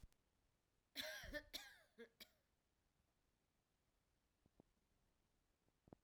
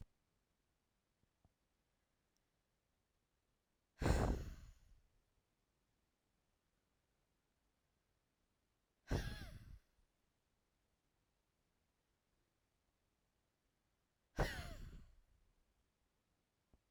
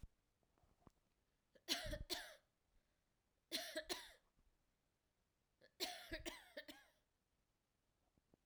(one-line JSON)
{"cough_length": "6.0 s", "cough_amplitude": 617, "cough_signal_mean_std_ratio": 0.32, "exhalation_length": "16.9 s", "exhalation_amplitude": 3026, "exhalation_signal_mean_std_ratio": 0.22, "three_cough_length": "8.5 s", "three_cough_amplitude": 1941, "three_cough_signal_mean_std_ratio": 0.35, "survey_phase": "alpha (2021-03-01 to 2021-08-12)", "age": "18-44", "gender": "Female", "wearing_mask": "No", "symptom_none": true, "smoker_status": "Never smoked", "respiratory_condition_asthma": false, "respiratory_condition_other": false, "recruitment_source": "REACT", "submission_delay": "1 day", "covid_test_result": "Negative", "covid_test_method": "RT-qPCR"}